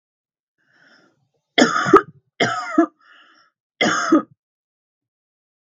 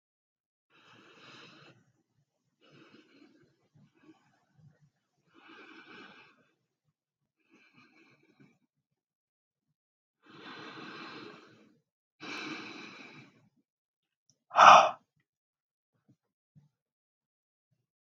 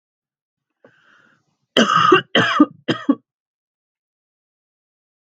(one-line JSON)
{"three_cough_length": "5.6 s", "three_cough_amplitude": 32768, "three_cough_signal_mean_std_ratio": 0.33, "exhalation_length": "18.2 s", "exhalation_amplitude": 25990, "exhalation_signal_mean_std_ratio": 0.14, "cough_length": "5.2 s", "cough_amplitude": 32768, "cough_signal_mean_std_ratio": 0.32, "survey_phase": "beta (2021-08-13 to 2022-03-07)", "age": "45-64", "gender": "Female", "wearing_mask": "No", "symptom_none": true, "symptom_onset": "9 days", "smoker_status": "Never smoked", "respiratory_condition_asthma": false, "respiratory_condition_other": false, "recruitment_source": "REACT", "submission_delay": "1 day", "covid_test_result": "Negative", "covid_test_method": "RT-qPCR"}